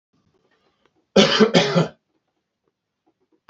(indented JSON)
{
  "cough_length": "3.5 s",
  "cough_amplitude": 29981,
  "cough_signal_mean_std_ratio": 0.33,
  "survey_phase": "beta (2021-08-13 to 2022-03-07)",
  "age": "45-64",
  "gender": "Male",
  "wearing_mask": "No",
  "symptom_fatigue": true,
  "smoker_status": "Never smoked",
  "respiratory_condition_asthma": false,
  "respiratory_condition_other": false,
  "recruitment_source": "REACT",
  "submission_delay": "1 day",
  "covid_test_result": "Negative",
  "covid_test_method": "RT-qPCR"
}